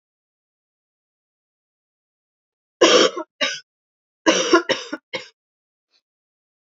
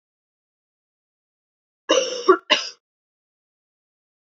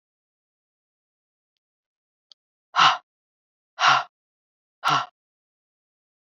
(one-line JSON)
{"three_cough_length": "6.7 s", "three_cough_amplitude": 29379, "three_cough_signal_mean_std_ratio": 0.28, "cough_length": "4.3 s", "cough_amplitude": 26976, "cough_signal_mean_std_ratio": 0.24, "exhalation_length": "6.4 s", "exhalation_amplitude": 23091, "exhalation_signal_mean_std_ratio": 0.24, "survey_phase": "beta (2021-08-13 to 2022-03-07)", "age": "45-64", "gender": "Female", "wearing_mask": "No", "symptom_cough_any": true, "symptom_runny_or_blocked_nose": true, "symptom_fatigue": true, "symptom_fever_high_temperature": true, "symptom_change_to_sense_of_smell_or_taste": true, "symptom_loss_of_taste": true, "symptom_onset": "3 days", "smoker_status": "Never smoked", "respiratory_condition_asthma": false, "respiratory_condition_other": false, "recruitment_source": "Test and Trace", "submission_delay": "2 days", "covid_test_result": "Positive", "covid_test_method": "RT-qPCR", "covid_ct_value": 14.9, "covid_ct_gene": "ORF1ab gene", "covid_ct_mean": 15.1, "covid_viral_load": "11000000 copies/ml", "covid_viral_load_category": "High viral load (>1M copies/ml)"}